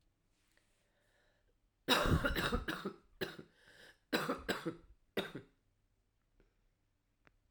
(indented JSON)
{
  "cough_length": "7.5 s",
  "cough_amplitude": 5064,
  "cough_signal_mean_std_ratio": 0.37,
  "survey_phase": "alpha (2021-03-01 to 2021-08-12)",
  "age": "18-44",
  "gender": "Female",
  "wearing_mask": "No",
  "symptom_cough_any": true,
  "symptom_headache": true,
  "symptom_change_to_sense_of_smell_or_taste": true,
  "smoker_status": "Never smoked",
  "respiratory_condition_asthma": false,
  "respiratory_condition_other": false,
  "recruitment_source": "Test and Trace",
  "submission_delay": "2 days",
  "covid_test_result": "Positive",
  "covid_test_method": "RT-qPCR",
  "covid_ct_value": 18.9,
  "covid_ct_gene": "N gene",
  "covid_ct_mean": 20.0,
  "covid_viral_load": "280000 copies/ml",
  "covid_viral_load_category": "Low viral load (10K-1M copies/ml)"
}